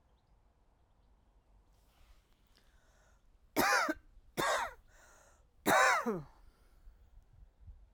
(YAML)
three_cough_length: 7.9 s
three_cough_amplitude: 6029
three_cough_signal_mean_std_ratio: 0.34
survey_phase: alpha (2021-03-01 to 2021-08-12)
age: 45-64
gender: Female
wearing_mask: 'No'
symptom_none: true
smoker_status: Ex-smoker
respiratory_condition_asthma: false
respiratory_condition_other: false
recruitment_source: REACT
submission_delay: 6 days
covid_test_result: Negative
covid_test_method: RT-qPCR